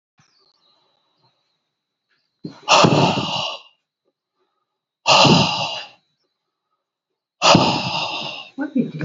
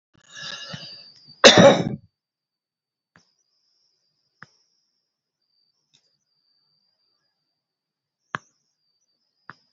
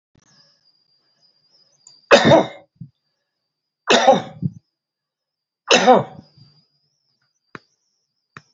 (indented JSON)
{
  "exhalation_length": "9.0 s",
  "exhalation_amplitude": 32767,
  "exhalation_signal_mean_std_ratio": 0.41,
  "cough_length": "9.7 s",
  "cough_amplitude": 32274,
  "cough_signal_mean_std_ratio": 0.17,
  "three_cough_length": "8.5 s",
  "three_cough_amplitude": 29598,
  "three_cough_signal_mean_std_ratio": 0.28,
  "survey_phase": "beta (2021-08-13 to 2022-03-07)",
  "age": "65+",
  "gender": "Male",
  "wearing_mask": "No",
  "symptom_runny_or_blocked_nose": true,
  "symptom_headache": true,
  "smoker_status": "Ex-smoker",
  "respiratory_condition_asthma": false,
  "respiratory_condition_other": false,
  "recruitment_source": "Test and Trace",
  "submission_delay": "2 days",
  "covid_test_result": "Positive",
  "covid_test_method": "RT-qPCR"
}